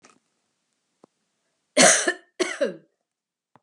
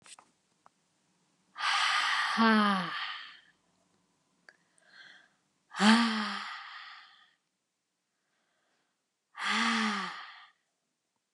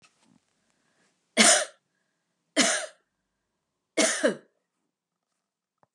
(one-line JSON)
{"cough_length": "3.6 s", "cough_amplitude": 27789, "cough_signal_mean_std_ratio": 0.29, "exhalation_length": "11.3 s", "exhalation_amplitude": 12863, "exhalation_signal_mean_std_ratio": 0.41, "three_cough_length": "5.9 s", "three_cough_amplitude": 23962, "three_cough_signal_mean_std_ratio": 0.29, "survey_phase": "beta (2021-08-13 to 2022-03-07)", "age": "45-64", "gender": "Female", "wearing_mask": "No", "symptom_headache": true, "smoker_status": "Never smoked", "respiratory_condition_asthma": false, "respiratory_condition_other": false, "recruitment_source": "Test and Trace", "submission_delay": "1 day", "covid_test_result": "Negative", "covid_test_method": "LAMP"}